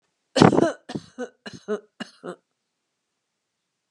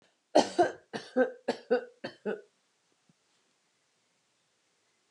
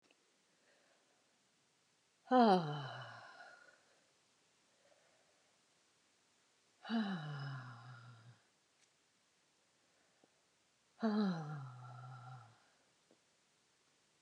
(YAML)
cough_length: 3.9 s
cough_amplitude: 29204
cough_signal_mean_std_ratio: 0.26
three_cough_length: 5.1 s
three_cough_amplitude: 10644
three_cough_signal_mean_std_ratio: 0.28
exhalation_length: 14.2 s
exhalation_amplitude: 4210
exhalation_signal_mean_std_ratio: 0.29
survey_phase: alpha (2021-03-01 to 2021-08-12)
age: 45-64
gender: Female
wearing_mask: 'No'
symptom_none: true
smoker_status: Ex-smoker
respiratory_condition_asthma: false
respiratory_condition_other: false
recruitment_source: REACT
submission_delay: 2 days
covid_test_result: Negative
covid_test_method: RT-qPCR